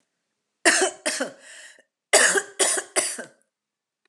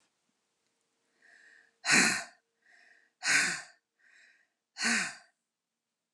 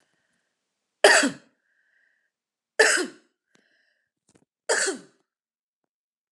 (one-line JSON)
{"cough_length": "4.1 s", "cough_amplitude": 27466, "cough_signal_mean_std_ratio": 0.42, "exhalation_length": "6.1 s", "exhalation_amplitude": 10886, "exhalation_signal_mean_std_ratio": 0.32, "three_cough_length": "6.3 s", "three_cough_amplitude": 24839, "three_cough_signal_mean_std_ratio": 0.26, "survey_phase": "alpha (2021-03-01 to 2021-08-12)", "age": "45-64", "gender": "Female", "wearing_mask": "No", "symptom_none": true, "smoker_status": "Ex-smoker", "respiratory_condition_asthma": false, "respiratory_condition_other": false, "recruitment_source": "Test and Trace", "submission_delay": "0 days", "covid_test_result": "Negative", "covid_test_method": "LFT"}